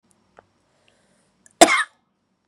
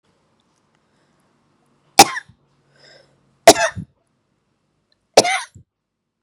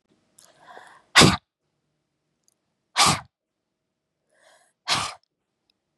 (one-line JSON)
{"cough_length": "2.5 s", "cough_amplitude": 32768, "cough_signal_mean_std_ratio": 0.2, "three_cough_length": "6.2 s", "three_cough_amplitude": 32768, "three_cough_signal_mean_std_ratio": 0.19, "exhalation_length": "6.0 s", "exhalation_amplitude": 32768, "exhalation_signal_mean_std_ratio": 0.23, "survey_phase": "beta (2021-08-13 to 2022-03-07)", "age": "18-44", "gender": "Female", "wearing_mask": "No", "symptom_none": true, "smoker_status": "Current smoker (e-cigarettes or vapes only)", "respiratory_condition_asthma": true, "respiratory_condition_other": false, "recruitment_source": "REACT", "submission_delay": "2 days", "covid_test_result": "Negative", "covid_test_method": "RT-qPCR", "influenza_a_test_result": "Negative", "influenza_b_test_result": "Negative"}